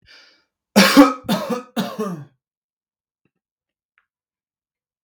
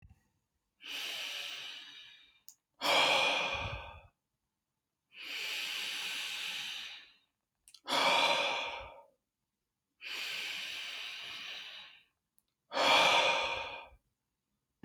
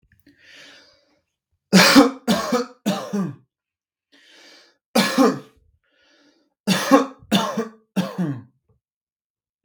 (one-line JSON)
{"cough_length": "5.0 s", "cough_amplitude": 32768, "cough_signal_mean_std_ratio": 0.29, "exhalation_length": "14.8 s", "exhalation_amplitude": 6395, "exhalation_signal_mean_std_ratio": 0.51, "three_cough_length": "9.6 s", "three_cough_amplitude": 32768, "three_cough_signal_mean_std_ratio": 0.38, "survey_phase": "beta (2021-08-13 to 2022-03-07)", "age": "18-44", "gender": "Male", "wearing_mask": "No", "symptom_none": true, "smoker_status": "Never smoked", "respiratory_condition_asthma": false, "respiratory_condition_other": false, "recruitment_source": "REACT", "submission_delay": "0 days", "covid_test_result": "Negative", "covid_test_method": "RT-qPCR", "influenza_a_test_result": "Negative", "influenza_b_test_result": "Negative"}